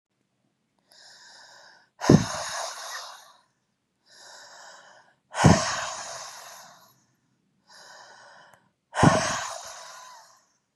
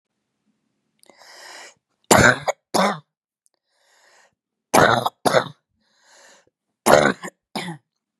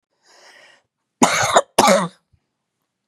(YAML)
exhalation_length: 10.8 s
exhalation_amplitude: 24489
exhalation_signal_mean_std_ratio: 0.3
three_cough_length: 8.2 s
three_cough_amplitude: 32768
three_cough_signal_mean_std_ratio: 0.3
cough_length: 3.1 s
cough_amplitude: 32768
cough_signal_mean_std_ratio: 0.36
survey_phase: beta (2021-08-13 to 2022-03-07)
age: 45-64
gender: Female
wearing_mask: 'No'
symptom_cough_any: true
smoker_status: Never smoked
respiratory_condition_asthma: false
respiratory_condition_other: false
recruitment_source: Test and Trace
submission_delay: 2 days
covid_test_result: Positive
covid_test_method: RT-qPCR
covid_ct_value: 27.6
covid_ct_gene: N gene